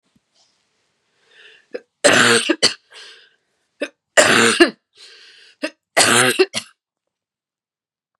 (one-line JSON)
{"three_cough_length": "8.2 s", "three_cough_amplitude": 32768, "three_cough_signal_mean_std_ratio": 0.36, "survey_phase": "beta (2021-08-13 to 2022-03-07)", "age": "45-64", "gender": "Female", "wearing_mask": "No", "symptom_cough_any": true, "symptom_headache": true, "smoker_status": "Never smoked", "respiratory_condition_asthma": false, "respiratory_condition_other": false, "recruitment_source": "REACT", "submission_delay": "1 day", "covid_test_result": "Negative", "covid_test_method": "RT-qPCR", "influenza_a_test_result": "Negative", "influenza_b_test_result": "Negative"}